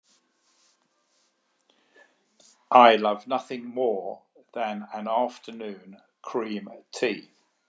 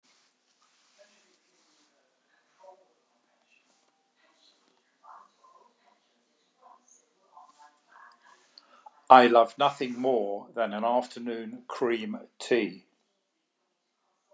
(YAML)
cough_length: 7.7 s
cough_amplitude: 28261
cough_signal_mean_std_ratio: 0.34
exhalation_length: 14.3 s
exhalation_amplitude: 29596
exhalation_signal_mean_std_ratio: 0.26
survey_phase: beta (2021-08-13 to 2022-03-07)
age: 65+
gender: Male
wearing_mask: 'No'
symptom_cough_any: true
symptom_headache: true
smoker_status: Never smoked
respiratory_condition_asthma: false
respiratory_condition_other: false
recruitment_source: Test and Trace
submission_delay: 1 day
covid_test_result: Negative
covid_test_method: RT-qPCR